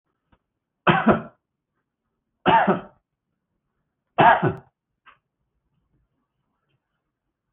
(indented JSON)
{
  "cough_length": "7.5 s",
  "cough_amplitude": 27405,
  "cough_signal_mean_std_ratio": 0.27,
  "survey_phase": "beta (2021-08-13 to 2022-03-07)",
  "age": "65+",
  "gender": "Male",
  "wearing_mask": "No",
  "symptom_none": true,
  "smoker_status": "Ex-smoker",
  "respiratory_condition_asthma": false,
  "respiratory_condition_other": false,
  "recruitment_source": "REACT",
  "submission_delay": "1 day",
  "covid_test_result": "Negative",
  "covid_test_method": "RT-qPCR",
  "influenza_a_test_result": "Negative",
  "influenza_b_test_result": "Negative"
}